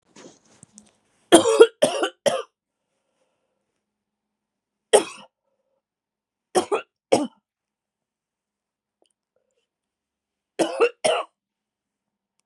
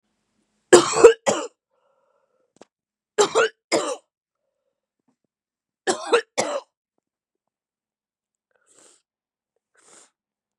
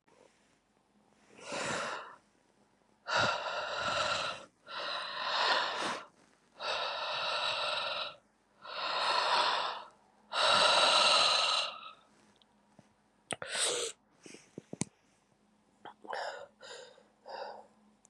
{
  "three_cough_length": "12.5 s",
  "three_cough_amplitude": 32767,
  "three_cough_signal_mean_std_ratio": 0.24,
  "cough_length": "10.6 s",
  "cough_amplitude": 32768,
  "cough_signal_mean_std_ratio": 0.23,
  "exhalation_length": "18.1 s",
  "exhalation_amplitude": 7213,
  "exhalation_signal_mean_std_ratio": 0.55,
  "survey_phase": "beta (2021-08-13 to 2022-03-07)",
  "age": "45-64",
  "gender": "Female",
  "wearing_mask": "No",
  "symptom_new_continuous_cough": true,
  "symptom_runny_or_blocked_nose": true,
  "symptom_shortness_of_breath": true,
  "symptom_fatigue": true,
  "symptom_fever_high_temperature": true,
  "symptom_headache": true,
  "symptom_change_to_sense_of_smell_or_taste": true,
  "symptom_loss_of_taste": true,
  "symptom_onset": "4 days",
  "smoker_status": "Current smoker (1 to 10 cigarettes per day)",
  "respiratory_condition_asthma": false,
  "respiratory_condition_other": false,
  "recruitment_source": "Test and Trace",
  "submission_delay": "1 day",
  "covid_test_method": "RT-qPCR"
}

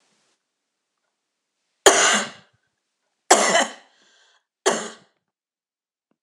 {
  "three_cough_length": "6.2 s",
  "three_cough_amplitude": 26028,
  "three_cough_signal_mean_std_ratio": 0.29,
  "survey_phase": "beta (2021-08-13 to 2022-03-07)",
  "age": "45-64",
  "gender": "Female",
  "wearing_mask": "No",
  "symptom_cough_any": true,
  "symptom_new_continuous_cough": true,
  "symptom_runny_or_blocked_nose": true,
  "symptom_sore_throat": true,
  "symptom_onset": "3 days",
  "smoker_status": "Never smoked",
  "respiratory_condition_asthma": false,
  "respiratory_condition_other": false,
  "recruitment_source": "Test and Trace",
  "submission_delay": "2 days",
  "covid_test_result": "Positive",
  "covid_test_method": "RT-qPCR",
  "covid_ct_value": 34.0,
  "covid_ct_gene": "ORF1ab gene"
}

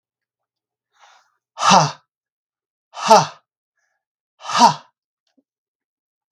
{
  "exhalation_length": "6.3 s",
  "exhalation_amplitude": 32768,
  "exhalation_signal_mean_std_ratio": 0.26,
  "survey_phase": "beta (2021-08-13 to 2022-03-07)",
  "age": "18-44",
  "gender": "Male",
  "wearing_mask": "No",
  "symptom_none": true,
  "smoker_status": "Never smoked",
  "respiratory_condition_asthma": false,
  "respiratory_condition_other": false,
  "recruitment_source": "REACT",
  "submission_delay": "1 day",
  "covid_test_result": "Negative",
  "covid_test_method": "RT-qPCR",
  "influenza_a_test_result": "Negative",
  "influenza_b_test_result": "Negative"
}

